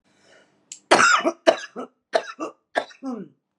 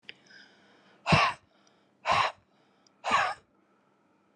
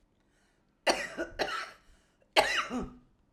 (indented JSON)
{
  "cough_length": "3.6 s",
  "cough_amplitude": 32768,
  "cough_signal_mean_std_ratio": 0.37,
  "exhalation_length": "4.4 s",
  "exhalation_amplitude": 10533,
  "exhalation_signal_mean_std_ratio": 0.35,
  "three_cough_length": "3.3 s",
  "three_cough_amplitude": 12646,
  "three_cough_signal_mean_std_ratio": 0.41,
  "survey_phase": "alpha (2021-03-01 to 2021-08-12)",
  "age": "45-64",
  "gender": "Female",
  "wearing_mask": "No",
  "symptom_none": true,
  "smoker_status": "Current smoker (1 to 10 cigarettes per day)",
  "respiratory_condition_asthma": true,
  "respiratory_condition_other": false,
  "recruitment_source": "REACT",
  "submission_delay": "1 day",
  "covid_test_result": "Negative",
  "covid_test_method": "RT-qPCR"
}